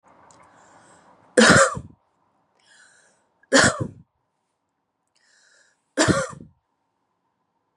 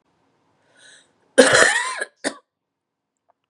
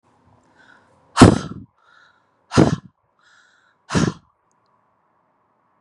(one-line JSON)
{"three_cough_length": "7.8 s", "three_cough_amplitude": 30737, "three_cough_signal_mean_std_ratio": 0.27, "cough_length": "3.5 s", "cough_amplitude": 32768, "cough_signal_mean_std_ratio": 0.31, "exhalation_length": "5.8 s", "exhalation_amplitude": 32768, "exhalation_signal_mean_std_ratio": 0.23, "survey_phase": "beta (2021-08-13 to 2022-03-07)", "age": "18-44", "gender": "Female", "wearing_mask": "No", "symptom_cough_any": true, "symptom_runny_or_blocked_nose": true, "symptom_shortness_of_breath": true, "symptom_sore_throat": true, "symptom_abdominal_pain": true, "symptom_fatigue": true, "symptom_fever_high_temperature": true, "symptom_headache": true, "symptom_onset": "4 days", "smoker_status": "Ex-smoker", "respiratory_condition_asthma": true, "respiratory_condition_other": false, "recruitment_source": "Test and Trace", "submission_delay": "2 days", "covid_test_result": "Positive", "covid_test_method": "RT-qPCR", "covid_ct_value": 27.5, "covid_ct_gene": "N gene"}